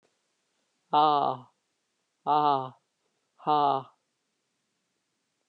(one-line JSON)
{"exhalation_length": "5.5 s", "exhalation_amplitude": 10107, "exhalation_signal_mean_std_ratio": 0.33, "survey_phase": "alpha (2021-03-01 to 2021-08-12)", "age": "65+", "gender": "Female", "wearing_mask": "No", "symptom_none": true, "smoker_status": "Never smoked", "respiratory_condition_asthma": false, "respiratory_condition_other": false, "recruitment_source": "REACT", "submission_delay": "3 days", "covid_test_result": "Negative", "covid_test_method": "RT-qPCR"}